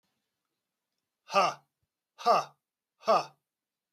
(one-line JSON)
{"three_cough_length": "3.9 s", "three_cough_amplitude": 8373, "three_cough_signal_mean_std_ratio": 0.29, "survey_phase": "beta (2021-08-13 to 2022-03-07)", "age": "45-64", "gender": "Male", "wearing_mask": "No", "symptom_none": true, "smoker_status": "Current smoker (11 or more cigarettes per day)", "respiratory_condition_asthma": false, "respiratory_condition_other": false, "recruitment_source": "REACT", "submission_delay": "1 day", "covid_test_result": "Negative", "covid_test_method": "RT-qPCR", "influenza_a_test_result": "Negative", "influenza_b_test_result": "Negative"}